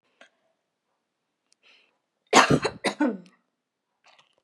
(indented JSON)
{
  "cough_length": "4.4 s",
  "cough_amplitude": 28321,
  "cough_signal_mean_std_ratio": 0.25,
  "survey_phase": "beta (2021-08-13 to 2022-03-07)",
  "age": "18-44",
  "gender": "Female",
  "wearing_mask": "No",
  "symptom_none": true,
  "smoker_status": "Ex-smoker",
  "respiratory_condition_asthma": false,
  "respiratory_condition_other": false,
  "recruitment_source": "REACT",
  "submission_delay": "4 days",
  "covid_test_result": "Negative",
  "covid_test_method": "RT-qPCR",
  "influenza_a_test_result": "Negative",
  "influenza_b_test_result": "Negative"
}